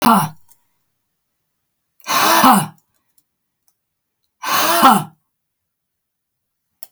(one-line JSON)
{"exhalation_length": "6.9 s", "exhalation_amplitude": 32767, "exhalation_signal_mean_std_ratio": 0.36, "survey_phase": "beta (2021-08-13 to 2022-03-07)", "age": "45-64", "gender": "Female", "wearing_mask": "No", "symptom_none": true, "smoker_status": "Never smoked", "respiratory_condition_asthma": false, "respiratory_condition_other": false, "recruitment_source": "REACT", "submission_delay": "2 days", "covid_test_result": "Negative", "covid_test_method": "RT-qPCR"}